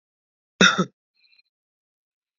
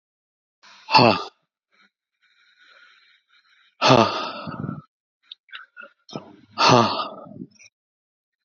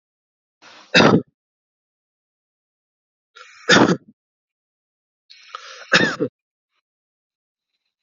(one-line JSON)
{"cough_length": "2.4 s", "cough_amplitude": 28841, "cough_signal_mean_std_ratio": 0.22, "exhalation_length": "8.4 s", "exhalation_amplitude": 28138, "exhalation_signal_mean_std_ratio": 0.3, "three_cough_length": "8.0 s", "three_cough_amplitude": 31059, "three_cough_signal_mean_std_ratio": 0.25, "survey_phase": "alpha (2021-03-01 to 2021-08-12)", "age": "18-44", "gender": "Male", "wearing_mask": "No", "symptom_none": true, "smoker_status": "Ex-smoker", "respiratory_condition_asthma": false, "respiratory_condition_other": false, "recruitment_source": "REACT", "submission_delay": "1 day", "covid_test_result": "Negative", "covid_test_method": "RT-qPCR"}